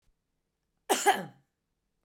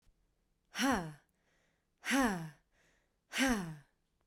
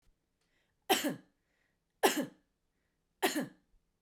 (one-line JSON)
{"cough_length": "2.0 s", "cough_amplitude": 10163, "cough_signal_mean_std_ratio": 0.28, "exhalation_length": "4.3 s", "exhalation_amplitude": 3487, "exhalation_signal_mean_std_ratio": 0.42, "three_cough_length": "4.0 s", "three_cough_amplitude": 8274, "three_cough_signal_mean_std_ratio": 0.3, "survey_phase": "beta (2021-08-13 to 2022-03-07)", "age": "18-44", "gender": "Female", "wearing_mask": "No", "symptom_none": true, "smoker_status": "Ex-smoker", "respiratory_condition_asthma": false, "respiratory_condition_other": false, "recruitment_source": "Test and Trace", "submission_delay": "1 day", "covid_test_result": "Negative", "covid_test_method": "RT-qPCR"}